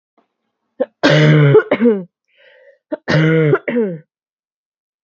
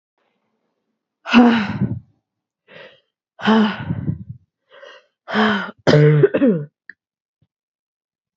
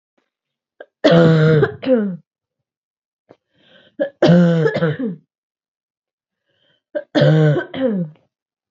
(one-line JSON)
{"cough_length": "5.0 s", "cough_amplitude": 32768, "cough_signal_mean_std_ratio": 0.51, "exhalation_length": "8.4 s", "exhalation_amplitude": 32755, "exhalation_signal_mean_std_ratio": 0.4, "three_cough_length": "8.7 s", "three_cough_amplitude": 32767, "three_cough_signal_mean_std_ratio": 0.45, "survey_phase": "alpha (2021-03-01 to 2021-08-12)", "age": "18-44", "gender": "Female", "wearing_mask": "No", "symptom_cough_any": true, "symptom_fatigue": true, "symptom_fever_high_temperature": true, "symptom_headache": true, "symptom_change_to_sense_of_smell_or_taste": true, "symptom_loss_of_taste": true, "symptom_onset": "3 days", "smoker_status": "Never smoked", "respiratory_condition_asthma": false, "respiratory_condition_other": false, "recruitment_source": "Test and Trace", "submission_delay": "2 days", "covid_test_result": "Positive", "covid_test_method": "RT-qPCR", "covid_ct_value": 16.0, "covid_ct_gene": "ORF1ab gene", "covid_ct_mean": 16.4, "covid_viral_load": "4300000 copies/ml", "covid_viral_load_category": "High viral load (>1M copies/ml)"}